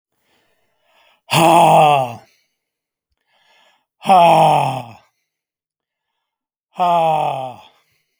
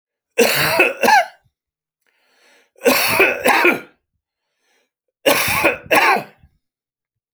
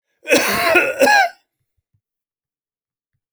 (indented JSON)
{
  "exhalation_length": "8.2 s",
  "exhalation_amplitude": 32767,
  "exhalation_signal_mean_std_ratio": 0.41,
  "three_cough_length": "7.3 s",
  "three_cough_amplitude": 32767,
  "three_cough_signal_mean_std_ratio": 0.48,
  "cough_length": "3.3 s",
  "cough_amplitude": 32767,
  "cough_signal_mean_std_ratio": 0.44,
  "survey_phase": "beta (2021-08-13 to 2022-03-07)",
  "age": "45-64",
  "gender": "Male",
  "wearing_mask": "No",
  "symptom_none": true,
  "smoker_status": "Never smoked",
  "respiratory_condition_asthma": false,
  "respiratory_condition_other": false,
  "recruitment_source": "REACT",
  "submission_delay": "1 day",
  "covid_test_result": "Negative",
  "covid_test_method": "RT-qPCR"
}